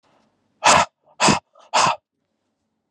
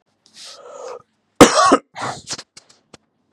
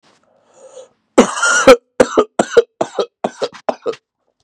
{"exhalation_length": "2.9 s", "exhalation_amplitude": 28614, "exhalation_signal_mean_std_ratio": 0.37, "cough_length": "3.3 s", "cough_amplitude": 32768, "cough_signal_mean_std_ratio": 0.3, "three_cough_length": "4.4 s", "three_cough_amplitude": 32768, "three_cough_signal_mean_std_ratio": 0.37, "survey_phase": "beta (2021-08-13 to 2022-03-07)", "age": "18-44", "gender": "Male", "wearing_mask": "No", "symptom_none": true, "symptom_onset": "12 days", "smoker_status": "Current smoker (11 or more cigarettes per day)", "respiratory_condition_asthma": false, "respiratory_condition_other": false, "recruitment_source": "REACT", "submission_delay": "-1 day", "covid_test_result": "Negative", "covid_test_method": "RT-qPCR", "influenza_a_test_result": "Negative", "influenza_b_test_result": "Negative"}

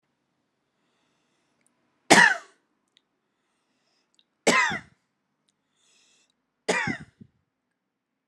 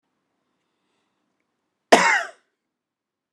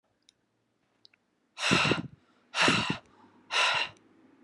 {"three_cough_length": "8.3 s", "three_cough_amplitude": 31510, "three_cough_signal_mean_std_ratio": 0.22, "cough_length": "3.3 s", "cough_amplitude": 32701, "cough_signal_mean_std_ratio": 0.22, "exhalation_length": "4.4 s", "exhalation_amplitude": 10738, "exhalation_signal_mean_std_ratio": 0.43, "survey_phase": "beta (2021-08-13 to 2022-03-07)", "age": "18-44", "gender": "Male", "wearing_mask": "No", "symptom_runny_or_blocked_nose": true, "symptom_shortness_of_breath": true, "symptom_headache": true, "symptom_onset": "4 days", "smoker_status": "Never smoked", "respiratory_condition_asthma": false, "respiratory_condition_other": false, "recruitment_source": "Test and Trace", "submission_delay": "2 days", "covid_test_result": "Positive", "covid_test_method": "RT-qPCR", "covid_ct_value": 30.3, "covid_ct_gene": "N gene", "covid_ct_mean": 30.6, "covid_viral_load": "91 copies/ml", "covid_viral_load_category": "Minimal viral load (< 10K copies/ml)"}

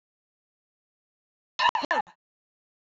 {"cough_length": "2.8 s", "cough_amplitude": 9333, "cough_signal_mean_std_ratio": 0.25, "survey_phase": "beta (2021-08-13 to 2022-03-07)", "age": "45-64", "gender": "Female", "wearing_mask": "No", "symptom_none": true, "symptom_onset": "6 days", "smoker_status": "Never smoked", "respiratory_condition_asthma": false, "respiratory_condition_other": false, "recruitment_source": "REACT", "submission_delay": "1 day", "covid_test_result": "Negative", "covid_test_method": "RT-qPCR", "influenza_a_test_result": "Unknown/Void", "influenza_b_test_result": "Unknown/Void"}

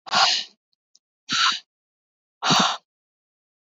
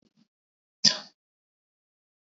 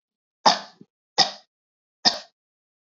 {"exhalation_length": "3.7 s", "exhalation_amplitude": 21146, "exhalation_signal_mean_std_ratio": 0.4, "cough_length": "2.4 s", "cough_amplitude": 24243, "cough_signal_mean_std_ratio": 0.15, "three_cough_length": "2.9 s", "three_cough_amplitude": 26719, "three_cough_signal_mean_std_ratio": 0.24, "survey_phase": "beta (2021-08-13 to 2022-03-07)", "age": "18-44", "gender": "Female", "wearing_mask": "No", "symptom_fatigue": true, "symptom_other": true, "symptom_onset": "4 days", "smoker_status": "Never smoked", "respiratory_condition_asthma": false, "respiratory_condition_other": false, "recruitment_source": "Test and Trace", "submission_delay": "3 days", "covid_test_result": "Negative", "covid_test_method": "RT-qPCR"}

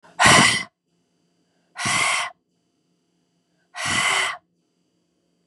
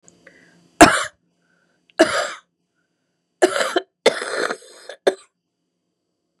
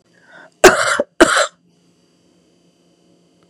{"exhalation_length": "5.5 s", "exhalation_amplitude": 29485, "exhalation_signal_mean_std_ratio": 0.39, "three_cough_length": "6.4 s", "three_cough_amplitude": 32768, "three_cough_signal_mean_std_ratio": 0.29, "cough_length": "3.5 s", "cough_amplitude": 32768, "cough_signal_mean_std_ratio": 0.3, "survey_phase": "beta (2021-08-13 to 2022-03-07)", "age": "45-64", "gender": "Female", "wearing_mask": "No", "symptom_cough_any": true, "symptom_runny_or_blocked_nose": true, "symptom_sore_throat": true, "symptom_abdominal_pain": true, "symptom_fatigue": true, "symptom_fever_high_temperature": true, "symptom_headache": true, "smoker_status": "Never smoked", "respiratory_condition_asthma": false, "respiratory_condition_other": false, "recruitment_source": "Test and Trace", "submission_delay": "1 day", "covid_test_result": "Positive", "covid_test_method": "ePCR"}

